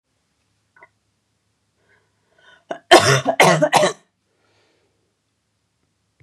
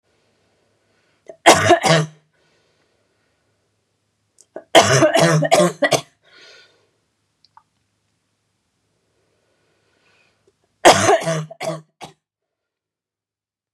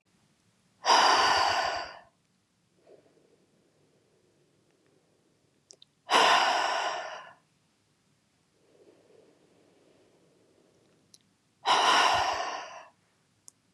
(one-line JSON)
{"cough_length": "6.2 s", "cough_amplitude": 32768, "cough_signal_mean_std_ratio": 0.28, "three_cough_length": "13.7 s", "three_cough_amplitude": 32768, "three_cough_signal_mean_std_ratio": 0.31, "exhalation_length": "13.7 s", "exhalation_amplitude": 11699, "exhalation_signal_mean_std_ratio": 0.38, "survey_phase": "beta (2021-08-13 to 2022-03-07)", "age": "18-44", "gender": "Female", "wearing_mask": "No", "symptom_cough_any": true, "symptom_sore_throat": true, "symptom_fatigue": true, "symptom_onset": "12 days", "smoker_status": "Never smoked", "respiratory_condition_asthma": false, "respiratory_condition_other": false, "recruitment_source": "REACT", "submission_delay": "2 days", "covid_test_result": "Negative", "covid_test_method": "RT-qPCR", "influenza_a_test_result": "Negative", "influenza_b_test_result": "Negative"}